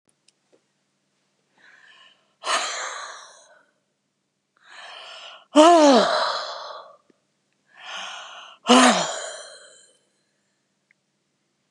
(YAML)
exhalation_length: 11.7 s
exhalation_amplitude: 31748
exhalation_signal_mean_std_ratio: 0.31
survey_phase: beta (2021-08-13 to 2022-03-07)
age: 65+
gender: Female
wearing_mask: 'No'
symptom_none: true
smoker_status: Never smoked
respiratory_condition_asthma: false
respiratory_condition_other: false
recruitment_source: REACT
submission_delay: 0 days
covid_test_result: Negative
covid_test_method: RT-qPCR